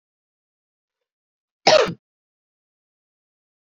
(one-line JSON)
{"cough_length": "3.8 s", "cough_amplitude": 28041, "cough_signal_mean_std_ratio": 0.19, "survey_phase": "beta (2021-08-13 to 2022-03-07)", "age": "18-44", "gender": "Female", "wearing_mask": "No", "symptom_cough_any": true, "symptom_runny_or_blocked_nose": true, "symptom_shortness_of_breath": true, "symptom_fatigue": true, "symptom_change_to_sense_of_smell_or_taste": true, "symptom_other": true, "smoker_status": "Never smoked", "respiratory_condition_asthma": false, "respiratory_condition_other": false, "recruitment_source": "Test and Trace", "submission_delay": "3 days", "covid_test_result": "Positive", "covid_test_method": "RT-qPCR", "covid_ct_value": 27.2, "covid_ct_gene": "N gene"}